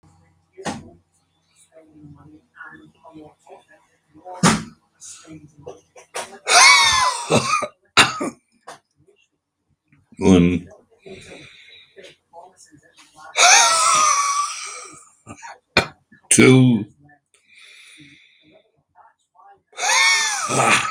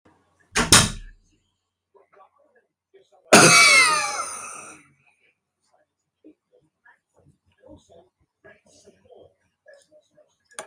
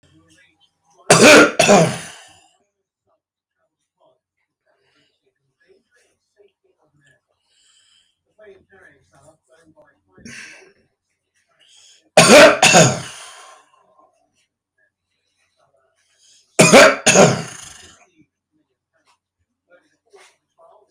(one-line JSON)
{"exhalation_length": "20.9 s", "exhalation_amplitude": 32768, "exhalation_signal_mean_std_ratio": 0.4, "cough_length": "10.7 s", "cough_amplitude": 32768, "cough_signal_mean_std_ratio": 0.27, "three_cough_length": "20.9 s", "three_cough_amplitude": 32768, "three_cough_signal_mean_std_ratio": 0.27, "survey_phase": "beta (2021-08-13 to 2022-03-07)", "age": "65+", "gender": "Male", "wearing_mask": "No", "symptom_none": true, "smoker_status": "Prefer not to say", "respiratory_condition_asthma": true, "respiratory_condition_other": false, "recruitment_source": "REACT", "submission_delay": "2 days", "covid_test_result": "Negative", "covid_test_method": "RT-qPCR"}